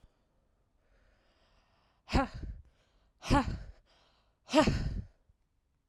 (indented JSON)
{
  "exhalation_length": "5.9 s",
  "exhalation_amplitude": 8046,
  "exhalation_signal_mean_std_ratio": 0.32,
  "survey_phase": "alpha (2021-03-01 to 2021-08-12)",
  "age": "18-44",
  "gender": "Female",
  "wearing_mask": "No",
  "symptom_none": true,
  "smoker_status": "Never smoked",
  "respiratory_condition_asthma": true,
  "respiratory_condition_other": false,
  "recruitment_source": "REACT",
  "submission_delay": "5 days",
  "covid_test_result": "Negative",
  "covid_test_method": "RT-qPCR"
}